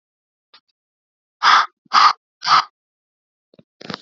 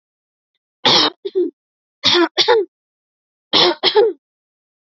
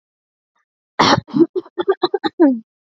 {"exhalation_length": "4.0 s", "exhalation_amplitude": 32614, "exhalation_signal_mean_std_ratio": 0.31, "three_cough_length": "4.9 s", "three_cough_amplitude": 32767, "three_cough_signal_mean_std_ratio": 0.45, "cough_length": "2.8 s", "cough_amplitude": 28856, "cough_signal_mean_std_ratio": 0.43, "survey_phase": "beta (2021-08-13 to 2022-03-07)", "age": "18-44", "gender": "Female", "wearing_mask": "No", "symptom_none": true, "smoker_status": "Never smoked", "respiratory_condition_asthma": false, "respiratory_condition_other": false, "recruitment_source": "REACT", "submission_delay": "2 days", "covid_test_result": "Negative", "covid_test_method": "RT-qPCR", "influenza_a_test_result": "Negative", "influenza_b_test_result": "Negative"}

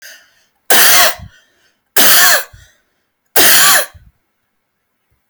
{"three_cough_length": "5.3 s", "three_cough_amplitude": 32768, "three_cough_signal_mean_std_ratio": 0.5, "survey_phase": "alpha (2021-03-01 to 2021-08-12)", "age": "18-44", "gender": "Female", "wearing_mask": "No", "symptom_none": true, "smoker_status": "Never smoked", "respiratory_condition_asthma": false, "respiratory_condition_other": false, "recruitment_source": "REACT", "submission_delay": "1 day", "covid_test_result": "Negative", "covid_test_method": "RT-qPCR"}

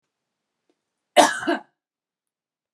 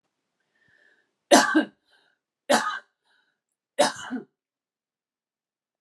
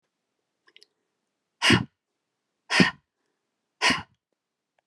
{"cough_length": "2.7 s", "cough_amplitude": 30710, "cough_signal_mean_std_ratio": 0.24, "three_cough_length": "5.8 s", "three_cough_amplitude": 29492, "three_cough_signal_mean_std_ratio": 0.27, "exhalation_length": "4.9 s", "exhalation_amplitude": 21559, "exhalation_signal_mean_std_ratio": 0.26, "survey_phase": "beta (2021-08-13 to 2022-03-07)", "age": "45-64", "gender": "Female", "wearing_mask": "No", "symptom_none": true, "smoker_status": "Ex-smoker", "respiratory_condition_asthma": true, "respiratory_condition_other": false, "recruitment_source": "REACT", "submission_delay": "3 days", "covid_test_result": "Negative", "covid_test_method": "RT-qPCR"}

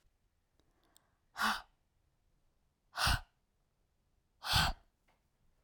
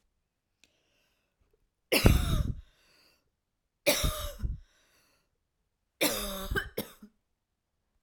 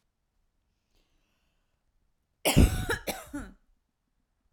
{"exhalation_length": "5.6 s", "exhalation_amplitude": 4241, "exhalation_signal_mean_std_ratio": 0.29, "three_cough_length": "8.0 s", "three_cough_amplitude": 17621, "three_cough_signal_mean_std_ratio": 0.34, "cough_length": "4.5 s", "cough_amplitude": 14568, "cough_signal_mean_std_ratio": 0.26, "survey_phase": "alpha (2021-03-01 to 2021-08-12)", "age": "18-44", "gender": "Female", "wearing_mask": "No", "symptom_fatigue": true, "smoker_status": "Never smoked", "respiratory_condition_asthma": false, "respiratory_condition_other": false, "recruitment_source": "REACT", "submission_delay": "3 days", "covid_test_result": "Negative", "covid_test_method": "RT-qPCR"}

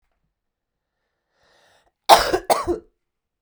{"cough_length": "3.4 s", "cough_amplitude": 32768, "cough_signal_mean_std_ratio": 0.25, "survey_phase": "beta (2021-08-13 to 2022-03-07)", "age": "18-44", "gender": "Female", "wearing_mask": "No", "symptom_runny_or_blocked_nose": true, "symptom_fatigue": true, "smoker_status": "Never smoked", "respiratory_condition_asthma": true, "respiratory_condition_other": false, "recruitment_source": "Test and Trace", "submission_delay": "2 days", "covid_test_result": "Positive", "covid_test_method": "ePCR"}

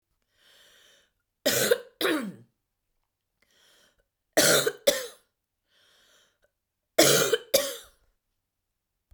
{"three_cough_length": "9.1 s", "three_cough_amplitude": 22254, "three_cough_signal_mean_std_ratio": 0.33, "survey_phase": "beta (2021-08-13 to 2022-03-07)", "age": "45-64", "gender": "Female", "wearing_mask": "No", "symptom_other": true, "symptom_onset": "8 days", "smoker_status": "Ex-smoker", "respiratory_condition_asthma": false, "respiratory_condition_other": false, "recruitment_source": "REACT", "submission_delay": "1 day", "covid_test_result": "Negative", "covid_test_method": "RT-qPCR", "influenza_a_test_result": "Negative", "influenza_b_test_result": "Negative"}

